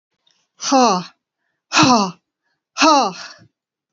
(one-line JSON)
{"exhalation_length": "3.9 s", "exhalation_amplitude": 30575, "exhalation_signal_mean_std_ratio": 0.42, "survey_phase": "alpha (2021-03-01 to 2021-08-12)", "age": "45-64", "gender": "Female", "wearing_mask": "No", "symptom_none": true, "smoker_status": "Never smoked", "respiratory_condition_asthma": false, "respiratory_condition_other": false, "recruitment_source": "REACT", "submission_delay": "2 days", "covid_test_result": "Negative", "covid_test_method": "RT-qPCR"}